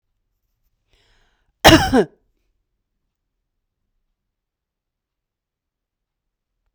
{"cough_length": "6.7 s", "cough_amplitude": 32768, "cough_signal_mean_std_ratio": 0.17, "survey_phase": "beta (2021-08-13 to 2022-03-07)", "age": "45-64", "gender": "Female", "wearing_mask": "No", "symptom_none": true, "smoker_status": "Never smoked", "respiratory_condition_asthma": false, "respiratory_condition_other": false, "recruitment_source": "REACT", "submission_delay": "1 day", "covid_test_result": "Negative", "covid_test_method": "RT-qPCR", "influenza_a_test_result": "Unknown/Void", "influenza_b_test_result": "Unknown/Void"}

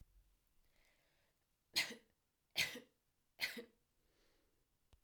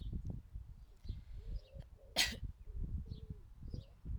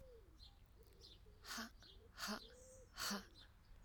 {"three_cough_length": "5.0 s", "three_cough_amplitude": 2888, "three_cough_signal_mean_std_ratio": 0.26, "cough_length": "4.2 s", "cough_amplitude": 4201, "cough_signal_mean_std_ratio": 0.68, "exhalation_length": "3.8 s", "exhalation_amplitude": 766, "exhalation_signal_mean_std_ratio": 0.61, "survey_phase": "alpha (2021-03-01 to 2021-08-12)", "age": "18-44", "gender": "Female", "wearing_mask": "No", "symptom_cough_any": true, "symptom_fatigue": true, "symptom_change_to_sense_of_smell_or_taste": true, "symptom_loss_of_taste": true, "symptom_onset": "5 days", "smoker_status": "Never smoked", "respiratory_condition_asthma": false, "respiratory_condition_other": false, "recruitment_source": "Test and Trace", "submission_delay": "2 days", "covid_test_result": "Positive", "covid_test_method": "RT-qPCR"}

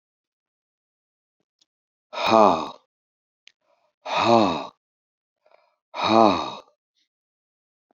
{"exhalation_length": "7.9 s", "exhalation_amplitude": 28276, "exhalation_signal_mean_std_ratio": 0.3, "survey_phase": "alpha (2021-03-01 to 2021-08-12)", "age": "65+", "gender": "Male", "wearing_mask": "No", "symptom_fatigue": true, "smoker_status": "Never smoked", "respiratory_condition_asthma": false, "respiratory_condition_other": false, "recruitment_source": "REACT", "submission_delay": "2 days", "covid_test_method": "RT-qPCR"}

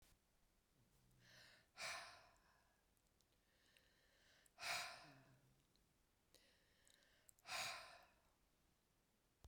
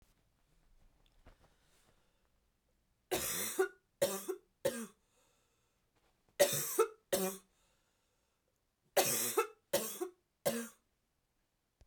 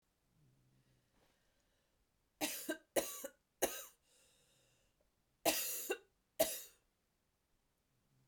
{"exhalation_length": "9.5 s", "exhalation_amplitude": 681, "exhalation_signal_mean_std_ratio": 0.37, "three_cough_length": "11.9 s", "three_cough_amplitude": 5762, "three_cough_signal_mean_std_ratio": 0.35, "cough_length": "8.3 s", "cough_amplitude": 3638, "cough_signal_mean_std_ratio": 0.3, "survey_phase": "beta (2021-08-13 to 2022-03-07)", "age": "45-64", "gender": "Female", "wearing_mask": "No", "symptom_cough_any": true, "symptom_new_continuous_cough": true, "symptom_runny_or_blocked_nose": true, "symptom_shortness_of_breath": true, "symptom_abdominal_pain": true, "symptom_fatigue": true, "symptom_fever_high_temperature": true, "symptom_headache": true, "symptom_onset": "3 days", "smoker_status": "Never smoked", "respiratory_condition_asthma": false, "respiratory_condition_other": false, "recruitment_source": "Test and Trace", "submission_delay": "2 days", "covid_test_result": "Positive", "covid_test_method": "LAMP"}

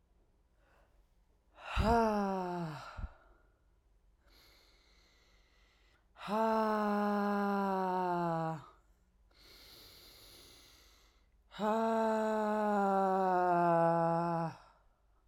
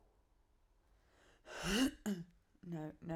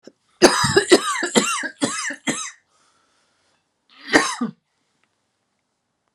{"exhalation_length": "15.3 s", "exhalation_amplitude": 5209, "exhalation_signal_mean_std_ratio": 0.59, "cough_length": "3.2 s", "cough_amplitude": 2157, "cough_signal_mean_std_ratio": 0.44, "three_cough_length": "6.1 s", "three_cough_amplitude": 32767, "three_cough_signal_mean_std_ratio": 0.38, "survey_phase": "beta (2021-08-13 to 2022-03-07)", "age": "18-44", "gender": "Female", "wearing_mask": "No", "symptom_cough_any": true, "symptom_runny_or_blocked_nose": true, "symptom_diarrhoea": true, "symptom_fatigue": true, "symptom_fever_high_temperature": true, "symptom_headache": true, "symptom_change_to_sense_of_smell_or_taste": true, "symptom_loss_of_taste": true, "symptom_other": true, "symptom_onset": "4 days", "smoker_status": "Ex-smoker", "respiratory_condition_asthma": false, "respiratory_condition_other": false, "recruitment_source": "Test and Trace", "submission_delay": "1 day", "covid_test_result": "Positive", "covid_test_method": "RT-qPCR"}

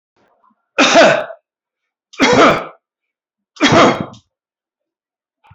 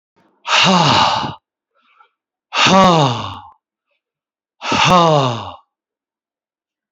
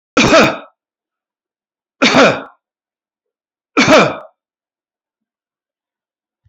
{"three_cough_length": "5.5 s", "three_cough_amplitude": 30391, "three_cough_signal_mean_std_ratio": 0.4, "exhalation_length": "6.9 s", "exhalation_amplitude": 32767, "exhalation_signal_mean_std_ratio": 0.48, "cough_length": "6.5 s", "cough_amplitude": 32370, "cough_signal_mean_std_ratio": 0.34, "survey_phase": "beta (2021-08-13 to 2022-03-07)", "age": "65+", "gender": "Male", "wearing_mask": "No", "symptom_runny_or_blocked_nose": true, "smoker_status": "Never smoked", "respiratory_condition_asthma": false, "respiratory_condition_other": false, "recruitment_source": "Test and Trace", "submission_delay": "5 days", "covid_test_result": "Positive", "covid_test_method": "RT-qPCR", "covid_ct_value": 20.6, "covid_ct_gene": "N gene"}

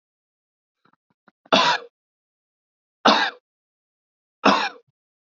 {"three_cough_length": "5.3 s", "three_cough_amplitude": 27958, "three_cough_signal_mean_std_ratio": 0.29, "survey_phase": "beta (2021-08-13 to 2022-03-07)", "age": "18-44", "gender": "Male", "wearing_mask": "No", "symptom_cough_any": true, "symptom_runny_or_blocked_nose": true, "symptom_sore_throat": true, "symptom_fatigue": true, "symptom_headache": true, "smoker_status": "Ex-smoker", "respiratory_condition_asthma": false, "respiratory_condition_other": false, "recruitment_source": "Test and Trace", "submission_delay": "1 day", "covid_test_result": "Positive", "covid_test_method": "ePCR"}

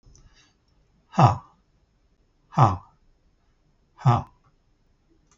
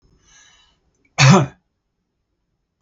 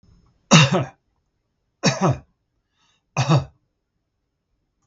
{"exhalation_length": "5.4 s", "exhalation_amplitude": 22351, "exhalation_signal_mean_std_ratio": 0.26, "cough_length": "2.8 s", "cough_amplitude": 32768, "cough_signal_mean_std_ratio": 0.26, "three_cough_length": "4.9 s", "three_cough_amplitude": 32768, "three_cough_signal_mean_std_ratio": 0.32, "survey_phase": "beta (2021-08-13 to 2022-03-07)", "age": "65+", "gender": "Male", "wearing_mask": "No", "symptom_runny_or_blocked_nose": true, "symptom_onset": "13 days", "smoker_status": "Ex-smoker", "respiratory_condition_asthma": false, "respiratory_condition_other": false, "recruitment_source": "REACT", "submission_delay": "1 day", "covid_test_result": "Negative", "covid_test_method": "RT-qPCR"}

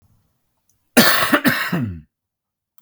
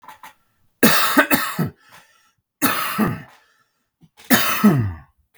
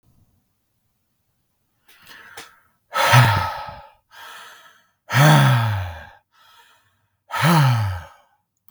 {"cough_length": "2.8 s", "cough_amplitude": 32768, "cough_signal_mean_std_ratio": 0.43, "three_cough_length": "5.4 s", "three_cough_amplitude": 32768, "three_cough_signal_mean_std_ratio": 0.48, "exhalation_length": "8.7 s", "exhalation_amplitude": 32768, "exhalation_signal_mean_std_ratio": 0.41, "survey_phase": "beta (2021-08-13 to 2022-03-07)", "age": "45-64", "gender": "Male", "wearing_mask": "No", "symptom_shortness_of_breath": true, "symptom_fatigue": true, "smoker_status": "Current smoker (1 to 10 cigarettes per day)", "respiratory_condition_asthma": true, "respiratory_condition_other": false, "recruitment_source": "Test and Trace", "submission_delay": "1 day", "covid_test_result": "Positive", "covid_test_method": "RT-qPCR", "covid_ct_value": 29.5, "covid_ct_gene": "ORF1ab gene", "covid_ct_mean": 30.1, "covid_viral_load": "140 copies/ml", "covid_viral_load_category": "Minimal viral load (< 10K copies/ml)"}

